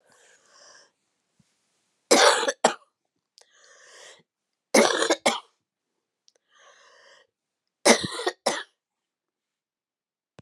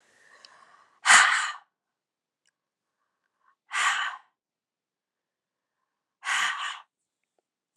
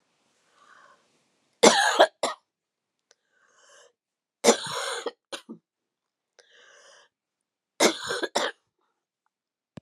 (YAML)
cough_length: 10.4 s
cough_amplitude: 28609
cough_signal_mean_std_ratio: 0.27
exhalation_length: 7.8 s
exhalation_amplitude: 23515
exhalation_signal_mean_std_ratio: 0.28
three_cough_length: 9.8 s
three_cough_amplitude: 32350
three_cough_signal_mean_std_ratio: 0.26
survey_phase: alpha (2021-03-01 to 2021-08-12)
age: 45-64
gender: Female
wearing_mask: 'No'
symptom_cough_any: true
symptom_fatigue: true
symptom_fever_high_temperature: true
symptom_headache: true
symptom_onset: 4 days
smoker_status: Never smoked
respiratory_condition_asthma: false
respiratory_condition_other: false
recruitment_source: Test and Trace
submission_delay: 2 days
covid_test_method: RT-qPCR